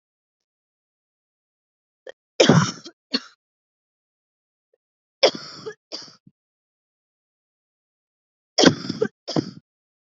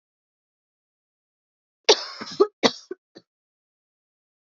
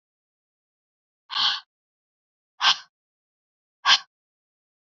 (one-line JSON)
{"three_cough_length": "10.2 s", "three_cough_amplitude": 28387, "three_cough_signal_mean_std_ratio": 0.22, "cough_length": "4.4 s", "cough_amplitude": 31271, "cough_signal_mean_std_ratio": 0.19, "exhalation_length": "4.9 s", "exhalation_amplitude": 22005, "exhalation_signal_mean_std_ratio": 0.24, "survey_phase": "beta (2021-08-13 to 2022-03-07)", "age": "18-44", "gender": "Female", "wearing_mask": "No", "symptom_cough_any": true, "symptom_runny_or_blocked_nose": true, "symptom_sore_throat": true, "symptom_abdominal_pain": true, "symptom_fever_high_temperature": true, "symptom_headache": true, "symptom_onset": "12 days", "smoker_status": "Never smoked", "respiratory_condition_asthma": false, "respiratory_condition_other": false, "recruitment_source": "REACT", "submission_delay": "2 days", "covid_test_result": "Positive", "covid_test_method": "RT-qPCR", "covid_ct_value": 18.0, "covid_ct_gene": "E gene", "influenza_a_test_result": "Negative", "influenza_b_test_result": "Negative"}